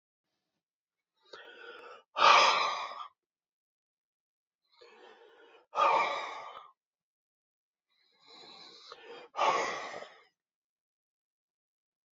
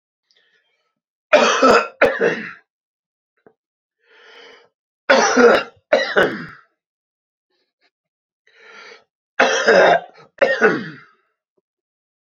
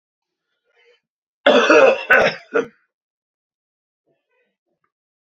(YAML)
exhalation_length: 12.1 s
exhalation_amplitude: 12641
exhalation_signal_mean_std_ratio: 0.3
three_cough_length: 12.3 s
three_cough_amplitude: 32768
three_cough_signal_mean_std_ratio: 0.38
cough_length: 5.3 s
cough_amplitude: 32768
cough_signal_mean_std_ratio: 0.32
survey_phase: beta (2021-08-13 to 2022-03-07)
age: 45-64
gender: Male
wearing_mask: 'No'
symptom_cough_any: true
symptom_runny_or_blocked_nose: true
smoker_status: Ex-smoker
respiratory_condition_asthma: false
respiratory_condition_other: false
recruitment_source: Test and Trace
submission_delay: 2 days
covid_test_result: Positive
covid_test_method: RT-qPCR
covid_ct_value: 28.5
covid_ct_gene: ORF1ab gene